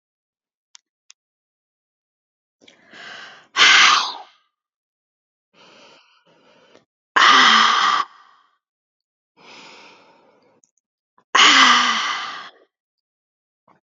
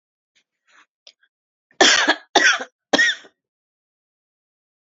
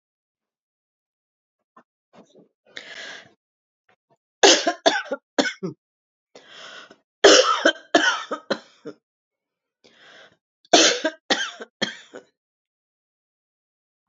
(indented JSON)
{
  "exhalation_length": "13.9 s",
  "exhalation_amplitude": 31979,
  "exhalation_signal_mean_std_ratio": 0.33,
  "cough_length": "4.9 s",
  "cough_amplitude": 31892,
  "cough_signal_mean_std_ratio": 0.31,
  "three_cough_length": "14.1 s",
  "three_cough_amplitude": 31458,
  "three_cough_signal_mean_std_ratio": 0.28,
  "survey_phase": "alpha (2021-03-01 to 2021-08-12)",
  "age": "45-64",
  "gender": "Female",
  "wearing_mask": "No",
  "symptom_none": true,
  "smoker_status": "Never smoked",
  "respiratory_condition_asthma": false,
  "respiratory_condition_other": false,
  "recruitment_source": "REACT",
  "submission_delay": "1 day",
  "covid_test_result": "Negative",
  "covid_test_method": "RT-qPCR"
}